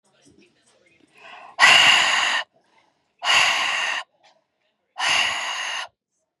{"exhalation_length": "6.4 s", "exhalation_amplitude": 30463, "exhalation_signal_mean_std_ratio": 0.48, "survey_phase": "beta (2021-08-13 to 2022-03-07)", "age": "18-44", "gender": "Female", "wearing_mask": "No", "symptom_none": true, "smoker_status": "Never smoked", "respiratory_condition_asthma": false, "respiratory_condition_other": false, "recruitment_source": "REACT", "submission_delay": "2 days", "covid_test_result": "Negative", "covid_test_method": "RT-qPCR", "influenza_a_test_result": "Negative", "influenza_b_test_result": "Negative"}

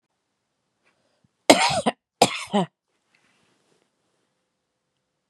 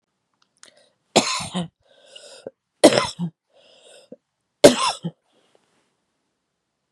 {"cough_length": "5.3 s", "cough_amplitude": 32768, "cough_signal_mean_std_ratio": 0.23, "three_cough_length": "6.9 s", "three_cough_amplitude": 32768, "three_cough_signal_mean_std_ratio": 0.24, "survey_phase": "beta (2021-08-13 to 2022-03-07)", "age": "45-64", "gender": "Female", "wearing_mask": "No", "symptom_headache": true, "symptom_onset": "8 days", "smoker_status": "Current smoker (e-cigarettes or vapes only)", "respiratory_condition_asthma": false, "respiratory_condition_other": false, "recruitment_source": "REACT", "submission_delay": "6 days", "covid_test_result": "Negative", "covid_test_method": "RT-qPCR", "influenza_a_test_result": "Unknown/Void", "influenza_b_test_result": "Unknown/Void"}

